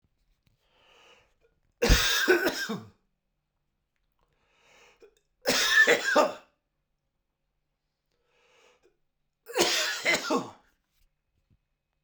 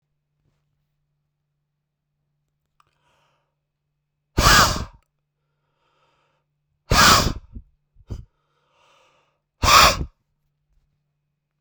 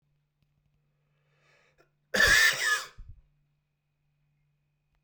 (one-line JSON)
{"three_cough_length": "12.0 s", "three_cough_amplitude": 15190, "three_cough_signal_mean_std_ratio": 0.36, "exhalation_length": "11.6 s", "exhalation_amplitude": 32768, "exhalation_signal_mean_std_ratio": 0.25, "cough_length": "5.0 s", "cough_amplitude": 10957, "cough_signal_mean_std_ratio": 0.29, "survey_phase": "beta (2021-08-13 to 2022-03-07)", "age": "45-64", "gender": "Male", "wearing_mask": "No", "symptom_cough_any": true, "symptom_runny_or_blocked_nose": true, "symptom_shortness_of_breath": true, "symptom_headache": true, "symptom_onset": "3 days", "smoker_status": "Ex-smoker", "respiratory_condition_asthma": true, "respiratory_condition_other": false, "recruitment_source": "Test and Trace", "submission_delay": "1 day", "covid_test_result": "Positive", "covid_test_method": "RT-qPCR"}